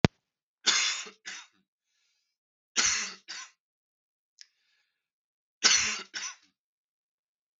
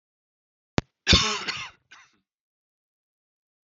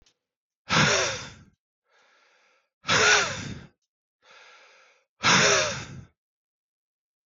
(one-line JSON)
{"three_cough_length": "7.6 s", "three_cough_amplitude": 32766, "three_cough_signal_mean_std_ratio": 0.29, "cough_length": "3.7 s", "cough_amplitude": 32768, "cough_signal_mean_std_ratio": 0.25, "exhalation_length": "7.3 s", "exhalation_amplitude": 16272, "exhalation_signal_mean_std_ratio": 0.39, "survey_phase": "beta (2021-08-13 to 2022-03-07)", "age": "18-44", "gender": "Male", "wearing_mask": "No", "symptom_cough_any": true, "symptom_runny_or_blocked_nose": true, "symptom_sore_throat": true, "symptom_fatigue": true, "smoker_status": "Never smoked", "respiratory_condition_asthma": false, "respiratory_condition_other": false, "recruitment_source": "Test and Trace", "submission_delay": "2 days", "covid_test_result": "Positive", "covid_test_method": "LFT"}